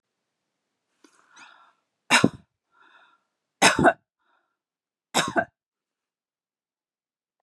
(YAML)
three_cough_length: 7.4 s
three_cough_amplitude: 27340
three_cough_signal_mean_std_ratio: 0.22
survey_phase: beta (2021-08-13 to 2022-03-07)
age: 18-44
gender: Female
wearing_mask: 'No'
symptom_none: true
smoker_status: Never smoked
respiratory_condition_asthma: false
respiratory_condition_other: false
recruitment_source: REACT
submission_delay: 3 days
covid_test_result: Negative
covid_test_method: RT-qPCR
influenza_a_test_result: Negative
influenza_b_test_result: Negative